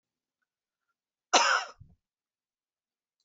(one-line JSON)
{"cough_length": "3.2 s", "cough_amplitude": 13924, "cough_signal_mean_std_ratio": 0.24, "survey_phase": "beta (2021-08-13 to 2022-03-07)", "age": "65+", "gender": "Female", "wearing_mask": "No", "symptom_cough_any": true, "symptom_fatigue": true, "symptom_onset": "6 days", "smoker_status": "Never smoked", "respiratory_condition_asthma": false, "respiratory_condition_other": false, "recruitment_source": "Test and Trace", "submission_delay": "2 days", "covid_test_result": "Positive", "covid_test_method": "RT-qPCR", "covid_ct_value": 17.4, "covid_ct_gene": "ORF1ab gene", "covid_ct_mean": 17.5, "covid_viral_load": "1800000 copies/ml", "covid_viral_load_category": "High viral load (>1M copies/ml)"}